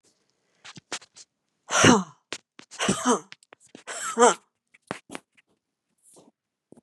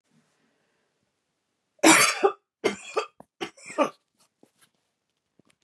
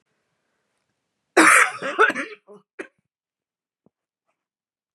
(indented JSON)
{
  "exhalation_length": "6.8 s",
  "exhalation_amplitude": 27393,
  "exhalation_signal_mean_std_ratio": 0.29,
  "three_cough_length": "5.6 s",
  "three_cough_amplitude": 24711,
  "three_cough_signal_mean_std_ratio": 0.27,
  "cough_length": "4.9 s",
  "cough_amplitude": 29524,
  "cough_signal_mean_std_ratio": 0.27,
  "survey_phase": "beta (2021-08-13 to 2022-03-07)",
  "age": "65+",
  "gender": "Female",
  "wearing_mask": "No",
  "symptom_none": true,
  "smoker_status": "Never smoked",
  "respiratory_condition_asthma": false,
  "respiratory_condition_other": false,
  "recruitment_source": "REACT",
  "submission_delay": "3 days",
  "covid_test_result": "Negative",
  "covid_test_method": "RT-qPCR",
  "influenza_a_test_result": "Negative",
  "influenza_b_test_result": "Negative"
}